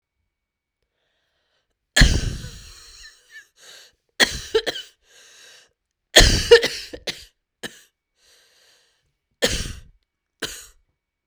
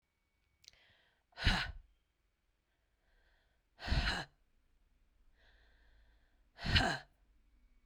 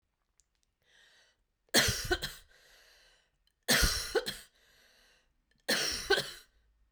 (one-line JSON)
{"cough_length": "11.3 s", "cough_amplitude": 32768, "cough_signal_mean_std_ratio": 0.26, "exhalation_length": "7.9 s", "exhalation_amplitude": 5360, "exhalation_signal_mean_std_ratio": 0.29, "three_cough_length": "6.9 s", "three_cough_amplitude": 10179, "three_cough_signal_mean_std_ratio": 0.37, "survey_phase": "beta (2021-08-13 to 2022-03-07)", "age": "45-64", "gender": "Female", "wearing_mask": "No", "symptom_cough_any": true, "symptom_runny_or_blocked_nose": true, "symptom_shortness_of_breath": true, "symptom_sore_throat": true, "symptom_fatigue": true, "symptom_headache": true, "symptom_change_to_sense_of_smell_or_taste": true, "symptom_onset": "4 days", "smoker_status": "Never smoked", "respiratory_condition_asthma": false, "respiratory_condition_other": false, "recruitment_source": "Test and Trace", "submission_delay": "1 day", "covid_test_result": "Positive", "covid_test_method": "RT-qPCR"}